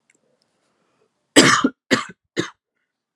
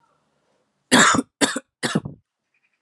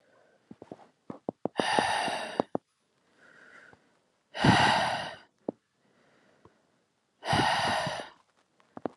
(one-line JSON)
{"cough_length": "3.2 s", "cough_amplitude": 32768, "cough_signal_mean_std_ratio": 0.29, "three_cough_length": "2.8 s", "three_cough_amplitude": 30226, "three_cough_signal_mean_std_ratio": 0.35, "exhalation_length": "9.0 s", "exhalation_amplitude": 15279, "exhalation_signal_mean_std_ratio": 0.4, "survey_phase": "alpha (2021-03-01 to 2021-08-12)", "age": "18-44", "gender": "Male", "wearing_mask": "No", "symptom_none": true, "smoker_status": "Never smoked", "respiratory_condition_asthma": false, "respiratory_condition_other": false, "recruitment_source": "REACT", "submission_delay": "3 days", "covid_test_result": "Negative", "covid_test_method": "RT-qPCR"}